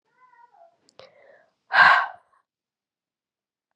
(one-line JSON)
{"exhalation_length": "3.8 s", "exhalation_amplitude": 22426, "exhalation_signal_mean_std_ratio": 0.24, "survey_phase": "beta (2021-08-13 to 2022-03-07)", "age": "18-44", "gender": "Female", "wearing_mask": "No", "symptom_cough_any": true, "symptom_runny_or_blocked_nose": true, "symptom_fatigue": true, "symptom_fever_high_temperature": true, "symptom_headache": true, "smoker_status": "Never smoked", "respiratory_condition_asthma": false, "respiratory_condition_other": false, "recruitment_source": "Test and Trace", "submission_delay": "2 days", "covid_test_result": "Positive", "covid_test_method": "RT-qPCR", "covid_ct_value": 19.3, "covid_ct_gene": "ORF1ab gene", "covid_ct_mean": 19.7, "covid_viral_load": "360000 copies/ml", "covid_viral_load_category": "Low viral load (10K-1M copies/ml)"}